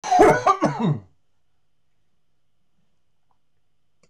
{"cough_length": "4.1 s", "cough_amplitude": 24320, "cough_signal_mean_std_ratio": 0.35, "survey_phase": "beta (2021-08-13 to 2022-03-07)", "age": "45-64", "gender": "Male", "wearing_mask": "No", "symptom_cough_any": true, "symptom_runny_or_blocked_nose": true, "symptom_sore_throat": true, "symptom_fatigue": true, "symptom_fever_high_temperature": true, "symptom_headache": true, "symptom_onset": "3 days", "smoker_status": "Never smoked", "respiratory_condition_asthma": false, "respiratory_condition_other": false, "recruitment_source": "Test and Trace", "submission_delay": "2 days", "covid_test_result": "Positive", "covid_test_method": "RT-qPCR", "covid_ct_value": 19.5, "covid_ct_gene": "ORF1ab gene", "covid_ct_mean": 20.6, "covid_viral_load": "170000 copies/ml", "covid_viral_load_category": "Low viral load (10K-1M copies/ml)"}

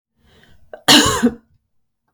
{"cough_length": "2.1 s", "cough_amplitude": 32768, "cough_signal_mean_std_ratio": 0.35, "survey_phase": "beta (2021-08-13 to 2022-03-07)", "age": "45-64", "gender": "Female", "wearing_mask": "No", "symptom_runny_or_blocked_nose": true, "symptom_headache": true, "symptom_onset": "8 days", "smoker_status": "Ex-smoker", "respiratory_condition_asthma": false, "respiratory_condition_other": false, "recruitment_source": "REACT", "submission_delay": "1 day", "covid_test_result": "Negative", "covid_test_method": "RT-qPCR"}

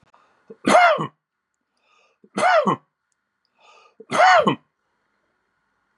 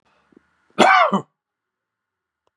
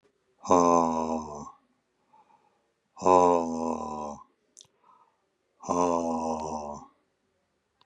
{"three_cough_length": "6.0 s", "three_cough_amplitude": 27586, "three_cough_signal_mean_std_ratio": 0.36, "cough_length": "2.6 s", "cough_amplitude": 31929, "cough_signal_mean_std_ratio": 0.31, "exhalation_length": "7.9 s", "exhalation_amplitude": 16001, "exhalation_signal_mean_std_ratio": 0.41, "survey_phase": "beta (2021-08-13 to 2022-03-07)", "age": "45-64", "gender": "Male", "wearing_mask": "No", "symptom_none": true, "smoker_status": "Never smoked", "respiratory_condition_asthma": false, "respiratory_condition_other": false, "recruitment_source": "REACT", "submission_delay": "2 days", "covid_test_result": "Negative", "covid_test_method": "RT-qPCR", "influenza_a_test_result": "Negative", "influenza_b_test_result": "Negative"}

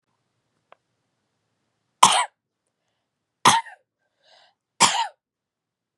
{"three_cough_length": "6.0 s", "three_cough_amplitude": 32767, "three_cough_signal_mean_std_ratio": 0.23, "survey_phase": "beta (2021-08-13 to 2022-03-07)", "age": "18-44", "gender": "Female", "wearing_mask": "No", "symptom_runny_or_blocked_nose": true, "smoker_status": "Never smoked", "respiratory_condition_asthma": false, "respiratory_condition_other": false, "recruitment_source": "REACT", "submission_delay": "2 days", "covid_test_result": "Negative", "covid_test_method": "RT-qPCR", "influenza_a_test_result": "Negative", "influenza_b_test_result": "Negative"}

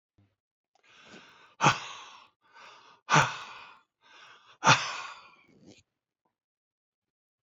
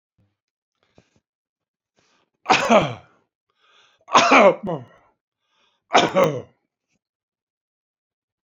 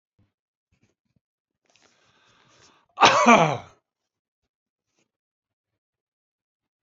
{"exhalation_length": "7.4 s", "exhalation_amplitude": 16076, "exhalation_signal_mean_std_ratio": 0.25, "three_cough_length": "8.4 s", "three_cough_amplitude": 31399, "three_cough_signal_mean_std_ratio": 0.3, "cough_length": "6.8 s", "cough_amplitude": 28712, "cough_signal_mean_std_ratio": 0.21, "survey_phase": "beta (2021-08-13 to 2022-03-07)", "age": "65+", "gender": "Male", "wearing_mask": "No", "symptom_runny_or_blocked_nose": true, "smoker_status": "Ex-smoker", "respiratory_condition_asthma": false, "respiratory_condition_other": false, "recruitment_source": "REACT", "submission_delay": "2 days", "covid_test_result": "Negative", "covid_test_method": "RT-qPCR", "influenza_a_test_result": "Negative", "influenza_b_test_result": "Negative"}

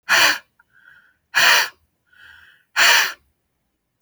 {"exhalation_length": "4.0 s", "exhalation_amplitude": 29142, "exhalation_signal_mean_std_ratio": 0.4, "survey_phase": "alpha (2021-03-01 to 2021-08-12)", "age": "45-64", "gender": "Male", "wearing_mask": "No", "symptom_none": true, "smoker_status": "Never smoked", "respiratory_condition_asthma": true, "respiratory_condition_other": false, "recruitment_source": "REACT", "submission_delay": "4 days", "covid_test_result": "Negative", "covid_test_method": "RT-qPCR"}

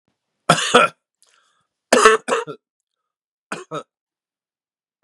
{"three_cough_length": "5.0 s", "three_cough_amplitude": 32768, "three_cough_signal_mean_std_ratio": 0.29, "survey_phase": "beta (2021-08-13 to 2022-03-07)", "age": "65+", "gender": "Male", "wearing_mask": "No", "symptom_none": true, "smoker_status": "Ex-smoker", "respiratory_condition_asthma": false, "respiratory_condition_other": false, "recruitment_source": "REACT", "submission_delay": "0 days", "covid_test_result": "Negative", "covid_test_method": "RT-qPCR"}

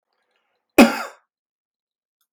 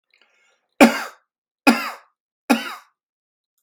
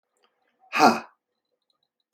{"cough_length": "2.3 s", "cough_amplitude": 32768, "cough_signal_mean_std_ratio": 0.2, "three_cough_length": "3.6 s", "three_cough_amplitude": 32768, "three_cough_signal_mean_std_ratio": 0.26, "exhalation_length": "2.1 s", "exhalation_amplitude": 24661, "exhalation_signal_mean_std_ratio": 0.24, "survey_phase": "beta (2021-08-13 to 2022-03-07)", "age": "45-64", "gender": "Male", "wearing_mask": "No", "symptom_none": true, "smoker_status": "Never smoked", "respiratory_condition_asthma": false, "respiratory_condition_other": false, "recruitment_source": "REACT", "submission_delay": "1 day", "covid_test_result": "Negative", "covid_test_method": "RT-qPCR", "influenza_a_test_result": "Negative", "influenza_b_test_result": "Negative"}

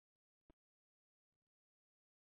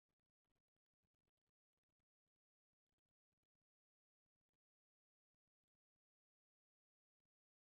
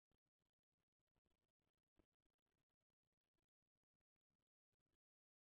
{"cough_length": "2.2 s", "cough_amplitude": 68, "cough_signal_mean_std_ratio": 0.05, "exhalation_length": "7.8 s", "exhalation_amplitude": 5, "exhalation_signal_mean_std_ratio": 0.15, "three_cough_length": "5.5 s", "three_cough_amplitude": 22, "three_cough_signal_mean_std_ratio": 0.21, "survey_phase": "beta (2021-08-13 to 2022-03-07)", "age": "45-64", "gender": "Female", "wearing_mask": "No", "symptom_none": true, "smoker_status": "Ex-smoker", "respiratory_condition_asthma": false, "respiratory_condition_other": false, "recruitment_source": "REACT", "submission_delay": "2 days", "covid_test_result": "Negative", "covid_test_method": "RT-qPCR", "influenza_a_test_result": "Negative", "influenza_b_test_result": "Negative"}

